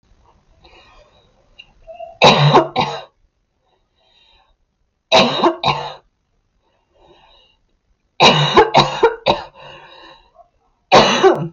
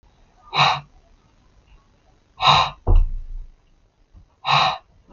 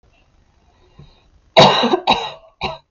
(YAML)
three_cough_length: 11.5 s
three_cough_amplitude: 32768
three_cough_signal_mean_std_ratio: 0.39
exhalation_length: 5.1 s
exhalation_amplitude: 32768
exhalation_signal_mean_std_ratio: 0.4
cough_length: 2.9 s
cough_amplitude: 32768
cough_signal_mean_std_ratio: 0.37
survey_phase: beta (2021-08-13 to 2022-03-07)
age: 18-44
gender: Female
wearing_mask: 'No'
symptom_cough_any: true
symptom_new_continuous_cough: true
symptom_runny_or_blocked_nose: true
symptom_sore_throat: true
symptom_fatigue: true
symptom_headache: true
symptom_onset: 4 days
smoker_status: Ex-smoker
respiratory_condition_asthma: false
respiratory_condition_other: false
recruitment_source: REACT
submission_delay: 2 days
covid_test_result: Negative
covid_test_method: RT-qPCR
influenza_a_test_result: Unknown/Void
influenza_b_test_result: Unknown/Void